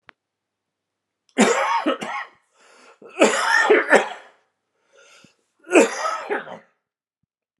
{"three_cough_length": "7.6 s", "three_cough_amplitude": 32026, "three_cough_signal_mean_std_ratio": 0.4, "survey_phase": "alpha (2021-03-01 to 2021-08-12)", "age": "45-64", "gender": "Male", "wearing_mask": "No", "symptom_new_continuous_cough": true, "symptom_abdominal_pain": true, "symptom_fatigue": true, "symptom_fever_high_temperature": true, "symptom_headache": true, "symptom_onset": "3 days", "smoker_status": "Ex-smoker", "respiratory_condition_asthma": false, "respiratory_condition_other": false, "recruitment_source": "Test and Trace", "submission_delay": "2 days", "covid_test_result": "Positive", "covid_test_method": "RT-qPCR", "covid_ct_value": 14.8, "covid_ct_gene": "ORF1ab gene", "covid_ct_mean": 15.1, "covid_viral_load": "11000000 copies/ml", "covid_viral_load_category": "High viral load (>1M copies/ml)"}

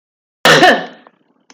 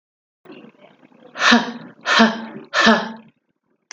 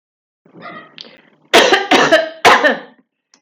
{"cough_length": "1.5 s", "cough_amplitude": 32767, "cough_signal_mean_std_ratio": 0.43, "exhalation_length": "3.9 s", "exhalation_amplitude": 30657, "exhalation_signal_mean_std_ratio": 0.41, "three_cough_length": "3.4 s", "three_cough_amplitude": 31975, "three_cough_signal_mean_std_ratio": 0.46, "survey_phase": "beta (2021-08-13 to 2022-03-07)", "age": "18-44", "gender": "Female", "wearing_mask": "No", "symptom_runny_or_blocked_nose": true, "symptom_sore_throat": true, "symptom_fatigue": true, "symptom_onset": "3 days", "smoker_status": "Ex-smoker", "respiratory_condition_asthma": false, "respiratory_condition_other": false, "recruitment_source": "Test and Trace", "submission_delay": "2 days", "covid_test_result": "Positive", "covid_test_method": "RT-qPCR"}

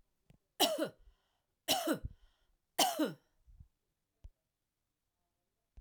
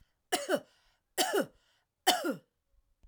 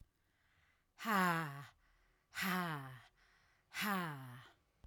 {"three_cough_length": "5.8 s", "three_cough_amplitude": 5615, "three_cough_signal_mean_std_ratio": 0.31, "cough_length": "3.1 s", "cough_amplitude": 9960, "cough_signal_mean_std_ratio": 0.39, "exhalation_length": "4.9 s", "exhalation_amplitude": 2678, "exhalation_signal_mean_std_ratio": 0.49, "survey_phase": "alpha (2021-03-01 to 2021-08-12)", "age": "45-64", "gender": "Female", "wearing_mask": "No", "symptom_none": true, "smoker_status": "Never smoked", "respiratory_condition_asthma": false, "respiratory_condition_other": false, "recruitment_source": "REACT", "submission_delay": "2 days", "covid_test_result": "Negative", "covid_test_method": "RT-qPCR"}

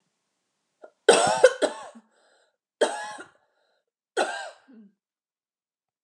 {"three_cough_length": "6.0 s", "three_cough_amplitude": 29100, "three_cough_signal_mean_std_ratio": 0.28, "survey_phase": "beta (2021-08-13 to 2022-03-07)", "age": "45-64", "gender": "Female", "wearing_mask": "No", "symptom_none": true, "smoker_status": "Never smoked", "respiratory_condition_asthma": false, "respiratory_condition_other": false, "recruitment_source": "REACT", "submission_delay": "2 days", "covid_test_result": "Negative", "covid_test_method": "RT-qPCR", "influenza_a_test_result": "Negative", "influenza_b_test_result": "Negative"}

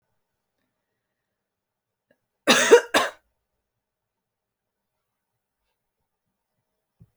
{"cough_length": "7.2 s", "cough_amplitude": 29004, "cough_signal_mean_std_ratio": 0.18, "survey_phase": "alpha (2021-03-01 to 2021-08-12)", "age": "18-44", "gender": "Female", "wearing_mask": "No", "symptom_cough_any": true, "symptom_shortness_of_breath": true, "symptom_fatigue": true, "symptom_fever_high_temperature": true, "symptom_headache": true, "symptom_onset": "3 days", "smoker_status": "Never smoked", "respiratory_condition_asthma": false, "respiratory_condition_other": false, "recruitment_source": "Test and Trace", "submission_delay": "2 days", "covid_test_result": "Positive", "covid_test_method": "RT-qPCR"}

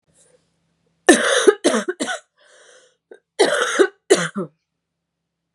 {"three_cough_length": "5.5 s", "three_cough_amplitude": 32768, "three_cough_signal_mean_std_ratio": 0.38, "survey_phase": "beta (2021-08-13 to 2022-03-07)", "age": "18-44", "gender": "Female", "wearing_mask": "No", "symptom_cough_any": true, "symptom_runny_or_blocked_nose": true, "symptom_shortness_of_breath": true, "symptom_sore_throat": true, "symptom_abdominal_pain": true, "symptom_fatigue": true, "symptom_headache": true, "symptom_change_to_sense_of_smell_or_taste": true, "symptom_onset": "6 days", "smoker_status": "Ex-smoker", "respiratory_condition_asthma": false, "respiratory_condition_other": false, "recruitment_source": "Test and Trace", "submission_delay": "2 days", "covid_test_result": "Positive", "covid_test_method": "RT-qPCR", "covid_ct_value": 18.7, "covid_ct_gene": "N gene", "covid_ct_mean": 19.6, "covid_viral_load": "390000 copies/ml", "covid_viral_load_category": "Low viral load (10K-1M copies/ml)"}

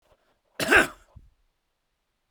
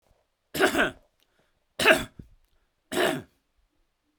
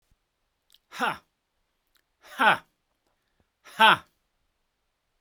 {"cough_length": "2.3 s", "cough_amplitude": 18201, "cough_signal_mean_std_ratio": 0.25, "three_cough_length": "4.2 s", "three_cough_amplitude": 24422, "three_cough_signal_mean_std_ratio": 0.34, "exhalation_length": "5.2 s", "exhalation_amplitude": 22687, "exhalation_signal_mean_std_ratio": 0.23, "survey_phase": "beta (2021-08-13 to 2022-03-07)", "age": "65+", "gender": "Male", "wearing_mask": "No", "symptom_none": true, "smoker_status": "Ex-smoker", "respiratory_condition_asthma": true, "respiratory_condition_other": false, "recruitment_source": "REACT", "submission_delay": "2 days", "covid_test_result": "Negative", "covid_test_method": "RT-qPCR", "influenza_a_test_result": "Negative", "influenza_b_test_result": "Negative"}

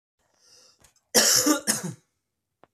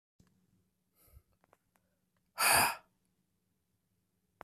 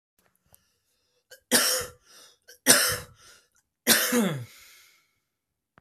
{"cough_length": "2.7 s", "cough_amplitude": 22752, "cough_signal_mean_std_ratio": 0.38, "exhalation_length": "4.4 s", "exhalation_amplitude": 6700, "exhalation_signal_mean_std_ratio": 0.23, "three_cough_length": "5.8 s", "three_cough_amplitude": 29754, "three_cough_signal_mean_std_ratio": 0.35, "survey_phase": "beta (2021-08-13 to 2022-03-07)", "age": "18-44", "gender": "Male", "wearing_mask": "No", "symptom_cough_any": true, "symptom_runny_or_blocked_nose": true, "symptom_fever_high_temperature": true, "symptom_headache": true, "symptom_change_to_sense_of_smell_or_taste": true, "symptom_onset": "4 days", "smoker_status": "Never smoked", "respiratory_condition_asthma": false, "respiratory_condition_other": false, "recruitment_source": "Test and Trace", "submission_delay": "2 days", "covid_test_result": "Positive", "covid_test_method": "RT-qPCR", "covid_ct_value": 21.3, "covid_ct_gene": "ORF1ab gene", "covid_ct_mean": 22.5, "covid_viral_load": "43000 copies/ml", "covid_viral_load_category": "Low viral load (10K-1M copies/ml)"}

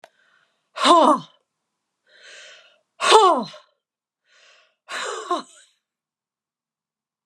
{"exhalation_length": "7.3 s", "exhalation_amplitude": 31973, "exhalation_signal_mean_std_ratio": 0.3, "survey_phase": "alpha (2021-03-01 to 2021-08-12)", "age": "65+", "gender": "Female", "wearing_mask": "No", "symptom_cough_any": true, "symptom_shortness_of_breath": true, "symptom_fatigue": true, "symptom_onset": "12 days", "smoker_status": "Never smoked", "respiratory_condition_asthma": false, "respiratory_condition_other": false, "recruitment_source": "REACT", "submission_delay": "1 day", "covid_test_result": "Negative", "covid_test_method": "RT-qPCR"}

